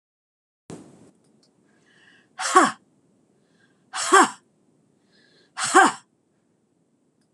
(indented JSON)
{
  "exhalation_length": "7.3 s",
  "exhalation_amplitude": 25481,
  "exhalation_signal_mean_std_ratio": 0.25,
  "survey_phase": "beta (2021-08-13 to 2022-03-07)",
  "age": "65+",
  "gender": "Female",
  "wearing_mask": "No",
  "symptom_none": true,
  "smoker_status": "Ex-smoker",
  "respiratory_condition_asthma": false,
  "respiratory_condition_other": false,
  "recruitment_source": "REACT",
  "submission_delay": "2 days",
  "covid_test_result": "Negative",
  "covid_test_method": "RT-qPCR"
}